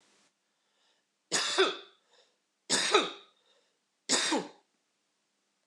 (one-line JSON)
{"three_cough_length": "5.7 s", "three_cough_amplitude": 10397, "three_cough_signal_mean_std_ratio": 0.36, "survey_phase": "beta (2021-08-13 to 2022-03-07)", "age": "18-44", "gender": "Male", "wearing_mask": "No", "symptom_none": true, "smoker_status": "Ex-smoker", "respiratory_condition_asthma": false, "respiratory_condition_other": false, "recruitment_source": "REACT", "submission_delay": "3 days", "covid_test_result": "Negative", "covid_test_method": "RT-qPCR"}